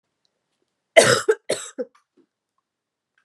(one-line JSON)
{"cough_length": "3.2 s", "cough_amplitude": 32381, "cough_signal_mean_std_ratio": 0.25, "survey_phase": "beta (2021-08-13 to 2022-03-07)", "age": "18-44", "gender": "Female", "wearing_mask": "No", "symptom_cough_any": true, "symptom_runny_or_blocked_nose": true, "symptom_shortness_of_breath": true, "symptom_sore_throat": true, "symptom_abdominal_pain": true, "symptom_fatigue": true, "symptom_fever_high_temperature": true, "symptom_headache": true, "symptom_change_to_sense_of_smell_or_taste": true, "symptom_loss_of_taste": true, "symptom_other": true, "symptom_onset": "3 days", "smoker_status": "Ex-smoker", "respiratory_condition_asthma": false, "respiratory_condition_other": false, "recruitment_source": "Test and Trace", "submission_delay": "1 day", "covid_test_result": "Positive", "covid_test_method": "RT-qPCR", "covid_ct_value": 19.7, "covid_ct_gene": "ORF1ab gene"}